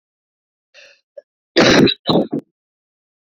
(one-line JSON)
{"cough_length": "3.3 s", "cough_amplitude": 32768, "cough_signal_mean_std_ratio": 0.35, "survey_phase": "beta (2021-08-13 to 2022-03-07)", "age": "18-44", "gender": "Female", "wearing_mask": "No", "symptom_cough_any": true, "symptom_new_continuous_cough": true, "symptom_runny_or_blocked_nose": true, "symptom_shortness_of_breath": true, "symptom_fatigue": true, "symptom_fever_high_temperature": true, "symptom_headache": true, "symptom_change_to_sense_of_smell_or_taste": true, "symptom_loss_of_taste": true, "symptom_onset": "4 days", "smoker_status": "Never smoked", "respiratory_condition_asthma": false, "respiratory_condition_other": false, "recruitment_source": "Test and Trace", "submission_delay": "1 day", "covid_test_result": "Positive", "covid_test_method": "RT-qPCR"}